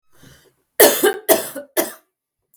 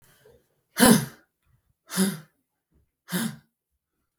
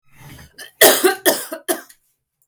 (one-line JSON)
{"three_cough_length": "2.6 s", "three_cough_amplitude": 32768, "three_cough_signal_mean_std_ratio": 0.37, "exhalation_length": "4.2 s", "exhalation_amplitude": 22436, "exhalation_signal_mean_std_ratio": 0.28, "cough_length": "2.5 s", "cough_amplitude": 32768, "cough_signal_mean_std_ratio": 0.38, "survey_phase": "beta (2021-08-13 to 2022-03-07)", "age": "18-44", "gender": "Female", "wearing_mask": "No", "symptom_runny_or_blocked_nose": true, "symptom_sore_throat": true, "symptom_fatigue": true, "smoker_status": "Ex-smoker", "respiratory_condition_asthma": false, "respiratory_condition_other": false, "recruitment_source": "REACT", "submission_delay": "2 days", "covid_test_result": "Negative", "covid_test_method": "RT-qPCR", "influenza_a_test_result": "Unknown/Void", "influenza_b_test_result": "Unknown/Void"}